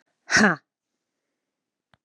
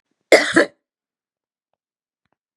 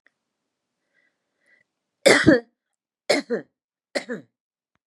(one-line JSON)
{"exhalation_length": "2.0 s", "exhalation_amplitude": 20422, "exhalation_signal_mean_std_ratio": 0.26, "cough_length": "2.6 s", "cough_amplitude": 32768, "cough_signal_mean_std_ratio": 0.24, "three_cough_length": "4.9 s", "three_cough_amplitude": 29703, "three_cough_signal_mean_std_ratio": 0.26, "survey_phase": "beta (2021-08-13 to 2022-03-07)", "age": "45-64", "gender": "Female", "wearing_mask": "No", "symptom_cough_any": true, "symptom_runny_or_blocked_nose": true, "symptom_sore_throat": true, "symptom_onset": "3 days", "smoker_status": "Never smoked", "respiratory_condition_asthma": false, "respiratory_condition_other": false, "recruitment_source": "REACT", "submission_delay": "1 day", "covid_test_result": "Positive", "covid_test_method": "RT-qPCR", "covid_ct_value": 35.0, "covid_ct_gene": "N gene", "influenza_a_test_result": "Negative", "influenza_b_test_result": "Negative"}